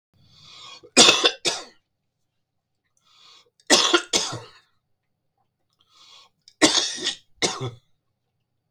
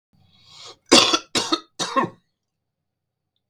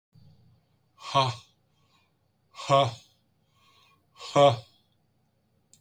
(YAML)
three_cough_length: 8.7 s
three_cough_amplitude: 32768
three_cough_signal_mean_std_ratio: 0.31
cough_length: 3.5 s
cough_amplitude: 32768
cough_signal_mean_std_ratio: 0.32
exhalation_length: 5.8 s
exhalation_amplitude: 12974
exhalation_signal_mean_std_ratio: 0.28
survey_phase: beta (2021-08-13 to 2022-03-07)
age: 45-64
gender: Male
wearing_mask: 'No'
symptom_runny_or_blocked_nose: true
symptom_fatigue: true
smoker_status: Ex-smoker
respiratory_condition_asthma: false
respiratory_condition_other: false
recruitment_source: REACT
submission_delay: 1 day
covid_test_result: Negative
covid_test_method: RT-qPCR
influenza_a_test_result: Negative
influenza_b_test_result: Negative